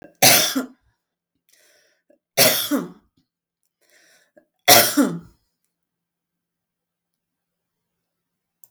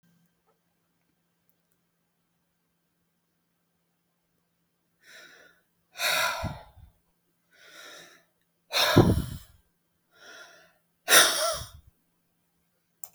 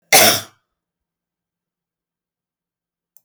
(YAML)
three_cough_length: 8.7 s
three_cough_amplitude: 32766
three_cough_signal_mean_std_ratio: 0.28
exhalation_length: 13.1 s
exhalation_amplitude: 23501
exhalation_signal_mean_std_ratio: 0.26
cough_length: 3.2 s
cough_amplitude: 32768
cough_signal_mean_std_ratio: 0.23
survey_phase: beta (2021-08-13 to 2022-03-07)
age: 65+
gender: Female
wearing_mask: 'No'
symptom_none: true
symptom_onset: 12 days
smoker_status: Never smoked
respiratory_condition_asthma: false
respiratory_condition_other: false
recruitment_source: REACT
submission_delay: 1 day
covid_test_result: Negative
covid_test_method: RT-qPCR
influenza_a_test_result: Negative
influenza_b_test_result: Negative